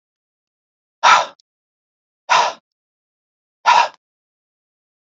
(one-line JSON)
{"exhalation_length": "5.1 s", "exhalation_amplitude": 29222, "exhalation_signal_mean_std_ratio": 0.28, "survey_phase": "beta (2021-08-13 to 2022-03-07)", "age": "45-64", "gender": "Male", "wearing_mask": "No", "symptom_none": true, "smoker_status": "Never smoked", "respiratory_condition_asthma": false, "respiratory_condition_other": false, "recruitment_source": "Test and Trace", "submission_delay": "2 days", "covid_test_result": "Positive", "covid_test_method": "ePCR"}